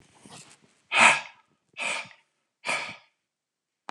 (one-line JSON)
{"exhalation_length": "3.9 s", "exhalation_amplitude": 20920, "exhalation_signal_mean_std_ratio": 0.3, "survey_phase": "beta (2021-08-13 to 2022-03-07)", "age": "45-64", "gender": "Male", "wearing_mask": "No", "symptom_none": true, "symptom_onset": "8 days", "smoker_status": "Never smoked", "respiratory_condition_asthma": false, "respiratory_condition_other": false, "recruitment_source": "REACT", "submission_delay": "1 day", "covid_test_result": "Negative", "covid_test_method": "RT-qPCR", "influenza_a_test_result": "Negative", "influenza_b_test_result": "Negative"}